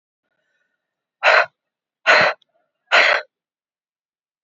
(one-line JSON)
{"exhalation_length": "4.4 s", "exhalation_amplitude": 28775, "exhalation_signal_mean_std_ratio": 0.33, "survey_phase": "beta (2021-08-13 to 2022-03-07)", "age": "45-64", "gender": "Female", "wearing_mask": "No", "symptom_cough_any": true, "symptom_diarrhoea": true, "symptom_change_to_sense_of_smell_or_taste": true, "symptom_other": true, "symptom_onset": "4 days", "smoker_status": "Never smoked", "respiratory_condition_asthma": false, "respiratory_condition_other": false, "recruitment_source": "Test and Trace", "submission_delay": "2 days", "covid_test_result": "Positive", "covid_test_method": "ePCR"}